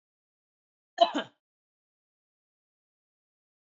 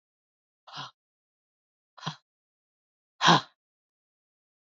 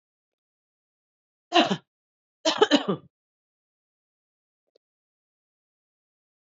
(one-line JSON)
{"cough_length": "3.8 s", "cough_amplitude": 13590, "cough_signal_mean_std_ratio": 0.14, "exhalation_length": "4.7 s", "exhalation_amplitude": 17149, "exhalation_signal_mean_std_ratio": 0.17, "three_cough_length": "6.5 s", "three_cough_amplitude": 20842, "three_cough_signal_mean_std_ratio": 0.21, "survey_phase": "beta (2021-08-13 to 2022-03-07)", "age": "45-64", "gender": "Female", "wearing_mask": "No", "symptom_cough_any": true, "smoker_status": "Ex-smoker", "respiratory_condition_asthma": false, "respiratory_condition_other": false, "recruitment_source": "REACT", "submission_delay": "2 days", "covid_test_result": "Negative", "covid_test_method": "RT-qPCR"}